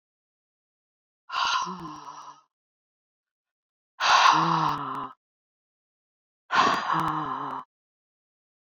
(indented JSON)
{
  "exhalation_length": "8.8 s",
  "exhalation_amplitude": 18437,
  "exhalation_signal_mean_std_ratio": 0.41,
  "survey_phase": "beta (2021-08-13 to 2022-03-07)",
  "age": "45-64",
  "gender": "Female",
  "wearing_mask": "No",
  "symptom_cough_any": true,
  "symptom_fatigue": true,
  "symptom_headache": true,
  "symptom_loss_of_taste": true,
  "smoker_status": "Never smoked",
  "respiratory_condition_asthma": false,
  "respiratory_condition_other": false,
  "recruitment_source": "Test and Trace",
  "submission_delay": "2 days",
  "covid_test_result": "Positive",
  "covid_test_method": "RT-qPCR",
  "covid_ct_value": 16.2,
  "covid_ct_gene": "ORF1ab gene",
  "covid_ct_mean": 16.4,
  "covid_viral_load": "4300000 copies/ml",
  "covid_viral_load_category": "High viral load (>1M copies/ml)"
}